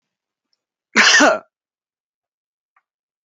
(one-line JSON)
{"cough_length": "3.2 s", "cough_amplitude": 28763, "cough_signal_mean_std_ratio": 0.29, "survey_phase": "alpha (2021-03-01 to 2021-08-12)", "age": "45-64", "gender": "Male", "wearing_mask": "No", "symptom_none": true, "smoker_status": "Never smoked", "respiratory_condition_asthma": false, "respiratory_condition_other": false, "recruitment_source": "REACT", "submission_delay": "1 day", "covid_test_result": "Negative", "covid_test_method": "RT-qPCR"}